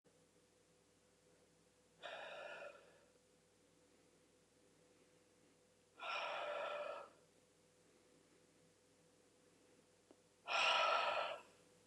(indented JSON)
{
  "exhalation_length": "11.9 s",
  "exhalation_amplitude": 1953,
  "exhalation_signal_mean_std_ratio": 0.37,
  "survey_phase": "beta (2021-08-13 to 2022-03-07)",
  "age": "65+",
  "gender": "Female",
  "wearing_mask": "No",
  "symptom_fatigue": true,
  "symptom_headache": true,
  "smoker_status": "Never smoked",
  "respiratory_condition_asthma": false,
  "respiratory_condition_other": false,
  "recruitment_source": "REACT",
  "submission_delay": "2 days",
  "covid_test_result": "Negative",
  "covid_test_method": "RT-qPCR",
  "influenza_a_test_result": "Negative",
  "influenza_b_test_result": "Negative"
}